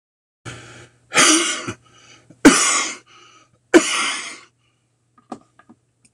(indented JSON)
{
  "three_cough_length": "6.1 s",
  "three_cough_amplitude": 26028,
  "three_cough_signal_mean_std_ratio": 0.35,
  "survey_phase": "alpha (2021-03-01 to 2021-08-12)",
  "age": "45-64",
  "gender": "Male",
  "wearing_mask": "No",
  "symptom_none": true,
  "smoker_status": "Never smoked",
  "recruitment_source": "REACT",
  "submission_delay": "2 days",
  "covid_test_result": "Negative",
  "covid_test_method": "RT-qPCR"
}